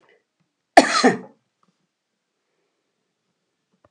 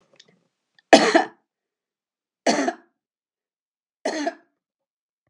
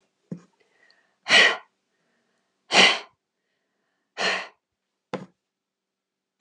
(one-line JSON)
{"cough_length": "3.9 s", "cough_amplitude": 32768, "cough_signal_mean_std_ratio": 0.2, "three_cough_length": "5.3 s", "three_cough_amplitude": 32768, "three_cough_signal_mean_std_ratio": 0.25, "exhalation_length": "6.4 s", "exhalation_amplitude": 27183, "exhalation_signal_mean_std_ratio": 0.26, "survey_phase": "beta (2021-08-13 to 2022-03-07)", "age": "65+", "gender": "Female", "wearing_mask": "No", "symptom_none": true, "smoker_status": "Never smoked", "respiratory_condition_asthma": false, "respiratory_condition_other": false, "recruitment_source": "REACT", "submission_delay": "2 days", "covid_test_result": "Negative", "covid_test_method": "RT-qPCR"}